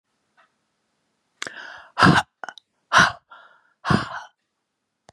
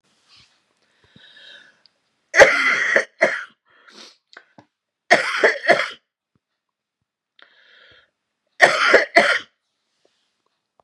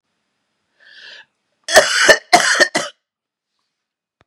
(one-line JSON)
{"exhalation_length": "5.1 s", "exhalation_amplitude": 28420, "exhalation_signal_mean_std_ratio": 0.28, "three_cough_length": "10.8 s", "three_cough_amplitude": 32768, "three_cough_signal_mean_std_ratio": 0.32, "cough_length": "4.3 s", "cough_amplitude": 32768, "cough_signal_mean_std_ratio": 0.34, "survey_phase": "beta (2021-08-13 to 2022-03-07)", "age": "45-64", "gender": "Female", "wearing_mask": "No", "symptom_new_continuous_cough": true, "symptom_runny_or_blocked_nose": true, "symptom_sore_throat": true, "symptom_onset": "3 days", "smoker_status": "Never smoked", "respiratory_condition_asthma": false, "respiratory_condition_other": false, "recruitment_source": "Test and Trace", "submission_delay": "2 days", "covid_test_result": "Negative", "covid_test_method": "ePCR"}